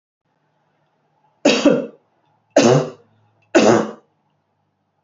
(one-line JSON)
{"three_cough_length": "5.0 s", "three_cough_amplitude": 28132, "three_cough_signal_mean_std_ratio": 0.35, "survey_phase": "beta (2021-08-13 to 2022-03-07)", "age": "65+", "gender": "Female", "wearing_mask": "No", "symptom_none": true, "smoker_status": "Never smoked", "respiratory_condition_asthma": false, "respiratory_condition_other": false, "recruitment_source": "REACT", "submission_delay": "1 day", "covid_test_result": "Negative", "covid_test_method": "RT-qPCR", "influenza_a_test_result": "Negative", "influenza_b_test_result": "Negative"}